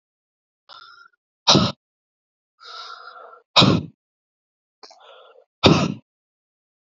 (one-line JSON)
{"exhalation_length": "6.8 s", "exhalation_amplitude": 32768, "exhalation_signal_mean_std_ratio": 0.27, "survey_phase": "alpha (2021-03-01 to 2021-08-12)", "age": "18-44", "gender": "Male", "wearing_mask": "No", "symptom_cough_any": true, "symptom_fatigue": true, "symptom_fever_high_temperature": true, "symptom_headache": true, "symptom_onset": "2 days", "smoker_status": "Never smoked", "respiratory_condition_asthma": true, "respiratory_condition_other": false, "recruitment_source": "Test and Trace", "submission_delay": "1 day", "covid_test_result": "Positive", "covid_test_method": "RT-qPCR"}